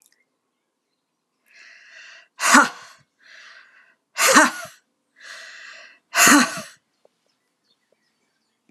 {
  "exhalation_length": "8.7 s",
  "exhalation_amplitude": 32662,
  "exhalation_signal_mean_std_ratio": 0.28,
  "survey_phase": "alpha (2021-03-01 to 2021-08-12)",
  "age": "45-64",
  "gender": "Female",
  "wearing_mask": "No",
  "symptom_shortness_of_breath": true,
  "symptom_headache": true,
  "symptom_onset": "12 days",
  "smoker_status": "Ex-smoker",
  "respiratory_condition_asthma": false,
  "respiratory_condition_other": false,
  "recruitment_source": "REACT",
  "submission_delay": "2 days",
  "covid_test_result": "Negative",
  "covid_test_method": "RT-qPCR"
}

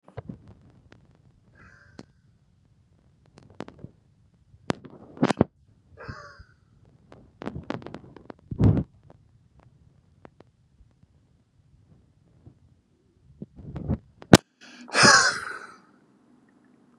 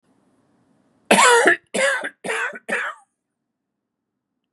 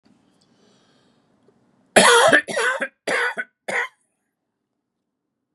{
  "exhalation_length": "17.0 s",
  "exhalation_amplitude": 32768,
  "exhalation_signal_mean_std_ratio": 0.21,
  "cough_length": "4.5 s",
  "cough_amplitude": 32466,
  "cough_signal_mean_std_ratio": 0.39,
  "three_cough_length": "5.5 s",
  "three_cough_amplitude": 32767,
  "three_cough_signal_mean_std_ratio": 0.35,
  "survey_phase": "beta (2021-08-13 to 2022-03-07)",
  "age": "45-64",
  "gender": "Male",
  "wearing_mask": "No",
  "symptom_none": true,
  "smoker_status": "Never smoked",
  "respiratory_condition_asthma": true,
  "respiratory_condition_other": false,
  "recruitment_source": "REACT",
  "submission_delay": "2 days",
  "covid_test_result": "Negative",
  "covid_test_method": "RT-qPCR",
  "influenza_a_test_result": "Negative",
  "influenza_b_test_result": "Negative"
}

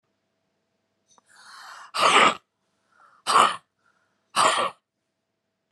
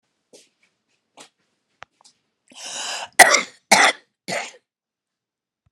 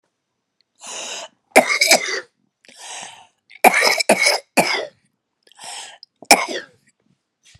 {
  "exhalation_length": "5.7 s",
  "exhalation_amplitude": 26135,
  "exhalation_signal_mean_std_ratio": 0.33,
  "cough_length": "5.7 s",
  "cough_amplitude": 32768,
  "cough_signal_mean_std_ratio": 0.24,
  "three_cough_length": "7.6 s",
  "three_cough_amplitude": 32768,
  "three_cough_signal_mean_std_ratio": 0.36,
  "survey_phase": "beta (2021-08-13 to 2022-03-07)",
  "age": "45-64",
  "gender": "Female",
  "wearing_mask": "No",
  "symptom_none": true,
  "smoker_status": "Current smoker (1 to 10 cigarettes per day)",
  "respiratory_condition_asthma": true,
  "respiratory_condition_other": false,
  "recruitment_source": "REACT",
  "submission_delay": "2 days",
  "covid_test_result": "Positive",
  "covid_test_method": "RT-qPCR",
  "covid_ct_value": 30.0,
  "covid_ct_gene": "E gene",
  "influenza_a_test_result": "Negative",
  "influenza_b_test_result": "Negative"
}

